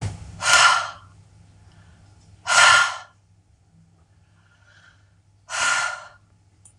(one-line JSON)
{"exhalation_length": "6.8 s", "exhalation_amplitude": 26027, "exhalation_signal_mean_std_ratio": 0.37, "survey_phase": "beta (2021-08-13 to 2022-03-07)", "age": "45-64", "gender": "Female", "wearing_mask": "No", "symptom_none": true, "smoker_status": "Never smoked", "respiratory_condition_asthma": false, "respiratory_condition_other": false, "recruitment_source": "REACT", "submission_delay": "3 days", "covid_test_result": "Negative", "covid_test_method": "RT-qPCR", "influenza_a_test_result": "Negative", "influenza_b_test_result": "Negative"}